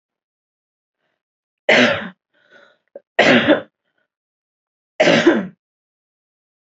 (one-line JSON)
{"three_cough_length": "6.7 s", "three_cough_amplitude": 28344, "three_cough_signal_mean_std_ratio": 0.33, "survey_phase": "alpha (2021-03-01 to 2021-08-12)", "age": "18-44", "gender": "Female", "wearing_mask": "No", "symptom_none": true, "smoker_status": "Never smoked", "respiratory_condition_asthma": false, "respiratory_condition_other": false, "recruitment_source": "REACT", "submission_delay": "1 day", "covid_test_result": "Negative", "covid_test_method": "RT-qPCR"}